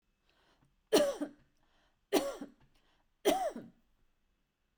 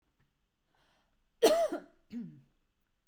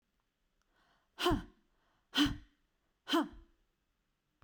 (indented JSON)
{
  "three_cough_length": "4.8 s",
  "three_cough_amplitude": 6505,
  "three_cough_signal_mean_std_ratio": 0.32,
  "cough_length": "3.1 s",
  "cough_amplitude": 8558,
  "cough_signal_mean_std_ratio": 0.29,
  "exhalation_length": "4.4 s",
  "exhalation_amplitude": 4393,
  "exhalation_signal_mean_std_ratio": 0.3,
  "survey_phase": "beta (2021-08-13 to 2022-03-07)",
  "age": "45-64",
  "gender": "Female",
  "wearing_mask": "No",
  "symptom_fatigue": true,
  "smoker_status": "Never smoked",
  "respiratory_condition_asthma": false,
  "respiratory_condition_other": false,
  "recruitment_source": "Test and Trace",
  "submission_delay": "1 day",
  "covid_test_result": "Negative",
  "covid_test_method": "RT-qPCR"
}